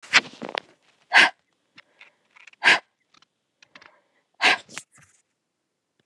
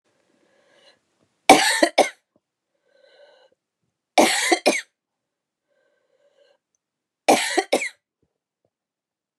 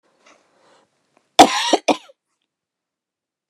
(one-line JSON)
{"exhalation_length": "6.1 s", "exhalation_amplitude": 30566, "exhalation_signal_mean_std_ratio": 0.24, "three_cough_length": "9.4 s", "three_cough_amplitude": 32768, "three_cough_signal_mean_std_ratio": 0.27, "cough_length": "3.5 s", "cough_amplitude": 32768, "cough_signal_mean_std_ratio": 0.22, "survey_phase": "beta (2021-08-13 to 2022-03-07)", "age": "45-64", "gender": "Female", "wearing_mask": "No", "symptom_cough_any": true, "symptom_runny_or_blocked_nose": true, "symptom_fatigue": true, "symptom_other": true, "symptom_onset": "2 days", "smoker_status": "Never smoked", "respiratory_condition_asthma": false, "respiratory_condition_other": false, "recruitment_source": "Test and Trace", "submission_delay": "1 day", "covid_test_result": "Positive", "covid_test_method": "RT-qPCR", "covid_ct_value": 24.6, "covid_ct_gene": "N gene"}